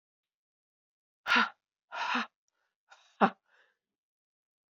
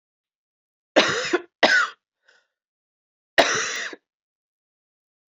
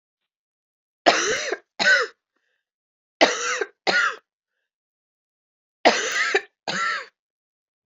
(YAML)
exhalation_length: 4.7 s
exhalation_amplitude: 13691
exhalation_signal_mean_std_ratio: 0.25
cough_length: 5.3 s
cough_amplitude: 27506
cough_signal_mean_std_ratio: 0.33
three_cough_length: 7.9 s
three_cough_amplitude: 27525
three_cough_signal_mean_std_ratio: 0.4
survey_phase: beta (2021-08-13 to 2022-03-07)
age: 18-44
gender: Female
wearing_mask: 'No'
symptom_cough_any: true
symptom_runny_or_blocked_nose: true
symptom_sore_throat: true
symptom_fatigue: true
smoker_status: Never smoked
respiratory_condition_asthma: true
respiratory_condition_other: false
recruitment_source: Test and Trace
submission_delay: 1 day
covid_test_result: Positive
covid_test_method: RT-qPCR
covid_ct_value: 22.7
covid_ct_gene: ORF1ab gene
covid_ct_mean: 25.0
covid_viral_load: 6100 copies/ml
covid_viral_load_category: Minimal viral load (< 10K copies/ml)